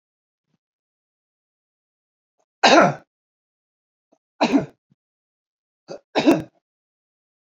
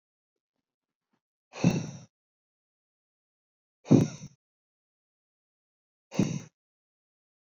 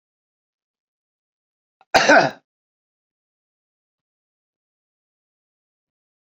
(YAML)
three_cough_length: 7.5 s
three_cough_amplitude: 28558
three_cough_signal_mean_std_ratio: 0.24
exhalation_length: 7.6 s
exhalation_amplitude: 18413
exhalation_signal_mean_std_ratio: 0.2
cough_length: 6.2 s
cough_amplitude: 27796
cough_signal_mean_std_ratio: 0.18
survey_phase: beta (2021-08-13 to 2022-03-07)
age: 45-64
gender: Male
wearing_mask: 'No'
symptom_none: true
smoker_status: Never smoked
respiratory_condition_asthma: false
respiratory_condition_other: false
recruitment_source: REACT
submission_delay: 1 day
covid_test_result: Negative
covid_test_method: RT-qPCR